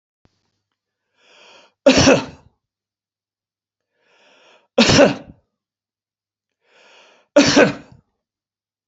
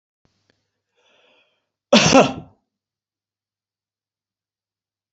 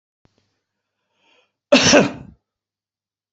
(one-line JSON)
{"three_cough_length": "8.9 s", "three_cough_amplitude": 32767, "three_cough_signal_mean_std_ratio": 0.28, "exhalation_length": "5.1 s", "exhalation_amplitude": 30928, "exhalation_signal_mean_std_ratio": 0.21, "cough_length": "3.3 s", "cough_amplitude": 28050, "cough_signal_mean_std_ratio": 0.27, "survey_phase": "beta (2021-08-13 to 2022-03-07)", "age": "65+", "gender": "Male", "wearing_mask": "No", "symptom_none": true, "smoker_status": "Ex-smoker", "respiratory_condition_asthma": false, "respiratory_condition_other": false, "recruitment_source": "REACT", "submission_delay": "1 day", "covid_test_result": "Negative", "covid_test_method": "RT-qPCR", "influenza_a_test_result": "Negative", "influenza_b_test_result": "Negative"}